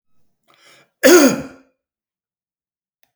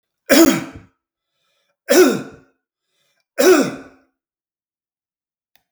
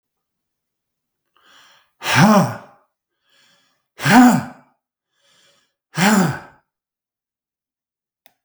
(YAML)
cough_length: 3.2 s
cough_amplitude: 32768
cough_signal_mean_std_ratio: 0.27
three_cough_length: 5.7 s
three_cough_amplitude: 32768
three_cough_signal_mean_std_ratio: 0.33
exhalation_length: 8.4 s
exhalation_amplitude: 32768
exhalation_signal_mean_std_ratio: 0.31
survey_phase: beta (2021-08-13 to 2022-03-07)
age: 65+
gender: Male
wearing_mask: 'No'
symptom_none: true
smoker_status: Never smoked
respiratory_condition_asthma: false
respiratory_condition_other: false
recruitment_source: REACT
submission_delay: 1 day
covid_test_result: Negative
covid_test_method: RT-qPCR
influenza_a_test_result: Unknown/Void
influenza_b_test_result: Unknown/Void